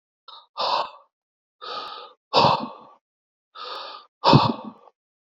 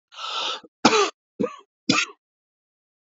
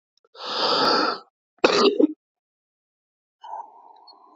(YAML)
exhalation_length: 5.2 s
exhalation_amplitude: 27637
exhalation_signal_mean_std_ratio: 0.36
three_cough_length: 3.1 s
three_cough_amplitude: 28192
three_cough_signal_mean_std_ratio: 0.38
cough_length: 4.4 s
cough_amplitude: 27147
cough_signal_mean_std_ratio: 0.42
survey_phase: alpha (2021-03-01 to 2021-08-12)
age: 45-64
gender: Male
wearing_mask: 'No'
symptom_cough_any: true
symptom_new_continuous_cough: true
symptom_shortness_of_breath: true
symptom_fatigue: true
symptom_fever_high_temperature: true
symptom_headache: true
symptom_change_to_sense_of_smell_or_taste: true
symptom_loss_of_taste: true
smoker_status: Ex-smoker
respiratory_condition_asthma: true
respiratory_condition_other: false
recruitment_source: Test and Trace
submission_delay: 1 day
covid_test_result: Positive
covid_test_method: RT-qPCR
covid_ct_value: 15.5
covid_ct_gene: ORF1ab gene
covid_ct_mean: 15.9
covid_viral_load: 6100000 copies/ml
covid_viral_load_category: High viral load (>1M copies/ml)